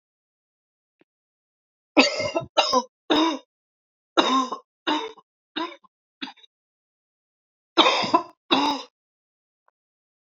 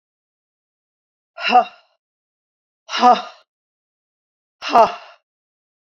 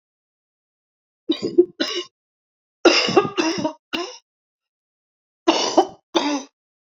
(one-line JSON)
{"three_cough_length": "10.2 s", "three_cough_amplitude": 28292, "three_cough_signal_mean_std_ratio": 0.35, "exhalation_length": "5.8 s", "exhalation_amplitude": 29732, "exhalation_signal_mean_std_ratio": 0.26, "cough_length": "6.9 s", "cough_amplitude": 29258, "cough_signal_mean_std_ratio": 0.38, "survey_phase": "beta (2021-08-13 to 2022-03-07)", "age": "65+", "gender": "Female", "wearing_mask": "No", "symptom_cough_any": true, "symptom_runny_or_blocked_nose": true, "symptom_sore_throat": true, "symptom_fever_high_temperature": true, "symptom_headache": true, "smoker_status": "Never smoked", "respiratory_condition_asthma": false, "respiratory_condition_other": false, "recruitment_source": "Test and Trace", "submission_delay": "1 day", "covid_test_result": "Positive", "covid_test_method": "RT-qPCR", "covid_ct_value": 35.0, "covid_ct_gene": "ORF1ab gene"}